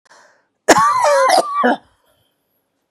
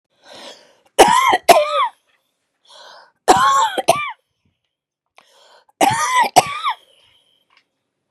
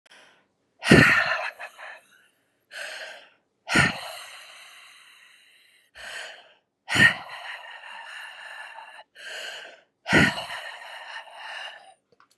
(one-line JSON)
{"cough_length": "2.9 s", "cough_amplitude": 32768, "cough_signal_mean_std_ratio": 0.52, "three_cough_length": "8.1 s", "three_cough_amplitude": 32768, "three_cough_signal_mean_std_ratio": 0.41, "exhalation_length": "12.4 s", "exhalation_amplitude": 29216, "exhalation_signal_mean_std_ratio": 0.34, "survey_phase": "beta (2021-08-13 to 2022-03-07)", "age": "65+", "gender": "Female", "wearing_mask": "No", "symptom_none": true, "smoker_status": "Ex-smoker", "respiratory_condition_asthma": false, "respiratory_condition_other": true, "recruitment_source": "REACT", "submission_delay": "3 days", "covid_test_result": "Negative", "covid_test_method": "RT-qPCR", "influenza_a_test_result": "Negative", "influenza_b_test_result": "Negative"}